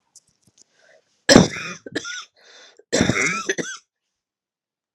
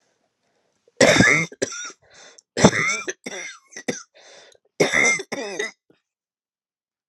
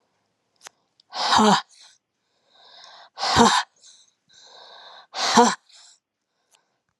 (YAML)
cough_length: 4.9 s
cough_amplitude: 32768
cough_signal_mean_std_ratio: 0.3
three_cough_length: 7.1 s
three_cough_amplitude: 32767
three_cough_signal_mean_std_ratio: 0.38
exhalation_length: 7.0 s
exhalation_amplitude: 29085
exhalation_signal_mean_std_ratio: 0.33
survey_phase: alpha (2021-03-01 to 2021-08-12)
age: 45-64
gender: Female
wearing_mask: 'No'
symptom_cough_any: true
symptom_shortness_of_breath: true
symptom_fatigue: true
symptom_onset: 3 days
smoker_status: Never smoked
respiratory_condition_asthma: false
respiratory_condition_other: false
recruitment_source: Test and Trace
submission_delay: 2 days
covid_ct_value: 27.1
covid_ct_gene: ORF1ab gene